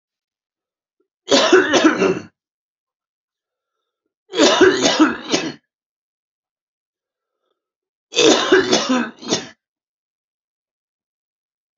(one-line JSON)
{"three_cough_length": "11.8 s", "three_cough_amplitude": 31925, "three_cough_signal_mean_std_ratio": 0.38, "survey_phase": "beta (2021-08-13 to 2022-03-07)", "age": "45-64", "gender": "Male", "wearing_mask": "No", "symptom_cough_any": true, "symptom_runny_or_blocked_nose": true, "smoker_status": "Current smoker (11 or more cigarettes per day)", "respiratory_condition_asthma": true, "respiratory_condition_other": false, "recruitment_source": "Test and Trace", "submission_delay": "2 days", "covid_test_result": "Positive", "covid_test_method": "RT-qPCR", "covid_ct_value": 15.7, "covid_ct_gene": "ORF1ab gene", "covid_ct_mean": 16.1, "covid_viral_load": "5400000 copies/ml", "covid_viral_load_category": "High viral load (>1M copies/ml)"}